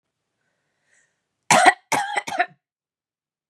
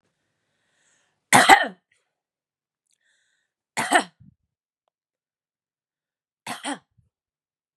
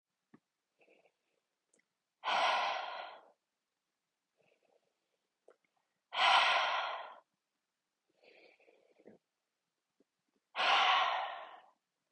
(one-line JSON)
{"cough_length": "3.5 s", "cough_amplitude": 32768, "cough_signal_mean_std_ratio": 0.29, "three_cough_length": "7.8 s", "three_cough_amplitude": 32767, "three_cough_signal_mean_std_ratio": 0.19, "exhalation_length": "12.1 s", "exhalation_amplitude": 5619, "exhalation_signal_mean_std_ratio": 0.36, "survey_phase": "beta (2021-08-13 to 2022-03-07)", "age": "18-44", "gender": "Female", "wearing_mask": "No", "symptom_none": true, "smoker_status": "Never smoked", "respiratory_condition_asthma": true, "respiratory_condition_other": false, "recruitment_source": "REACT", "submission_delay": "1 day", "covid_test_result": "Negative", "covid_test_method": "RT-qPCR", "influenza_a_test_result": "Negative", "influenza_b_test_result": "Negative"}